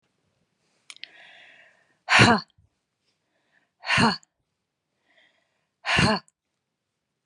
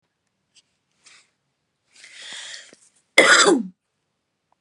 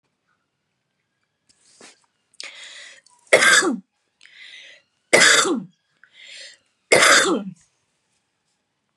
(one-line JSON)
{"exhalation_length": "7.3 s", "exhalation_amplitude": 24839, "exhalation_signal_mean_std_ratio": 0.27, "cough_length": "4.6 s", "cough_amplitude": 32768, "cough_signal_mean_std_ratio": 0.27, "three_cough_length": "9.0 s", "three_cough_amplitude": 32760, "three_cough_signal_mean_std_ratio": 0.33, "survey_phase": "beta (2021-08-13 to 2022-03-07)", "age": "65+", "gender": "Female", "wearing_mask": "No", "symptom_none": true, "smoker_status": "Ex-smoker", "respiratory_condition_asthma": false, "respiratory_condition_other": false, "recruitment_source": "REACT", "submission_delay": "1 day", "covid_test_result": "Negative", "covid_test_method": "RT-qPCR"}